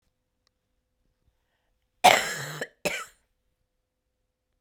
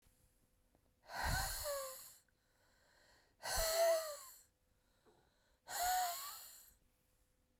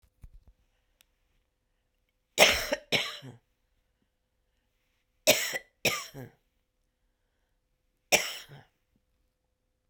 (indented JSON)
{
  "cough_length": "4.6 s",
  "cough_amplitude": 32767,
  "cough_signal_mean_std_ratio": 0.21,
  "exhalation_length": "7.6 s",
  "exhalation_amplitude": 1748,
  "exhalation_signal_mean_std_ratio": 0.46,
  "three_cough_length": "9.9 s",
  "three_cough_amplitude": 21326,
  "three_cough_signal_mean_std_ratio": 0.24,
  "survey_phase": "beta (2021-08-13 to 2022-03-07)",
  "age": "45-64",
  "gender": "Female",
  "wearing_mask": "No",
  "symptom_cough_any": true,
  "symptom_new_continuous_cough": true,
  "symptom_runny_or_blocked_nose": true,
  "symptom_headache": true,
  "symptom_change_to_sense_of_smell_or_taste": true,
  "symptom_loss_of_taste": true,
  "symptom_onset": "3 days",
  "smoker_status": "Never smoked",
  "respiratory_condition_asthma": false,
  "respiratory_condition_other": false,
  "recruitment_source": "Test and Trace",
  "submission_delay": "1 day",
  "covid_test_result": "Positive",
  "covid_test_method": "RT-qPCR",
  "covid_ct_value": 24.2,
  "covid_ct_gene": "N gene",
  "covid_ct_mean": 24.7,
  "covid_viral_load": "8000 copies/ml",
  "covid_viral_load_category": "Minimal viral load (< 10K copies/ml)"
}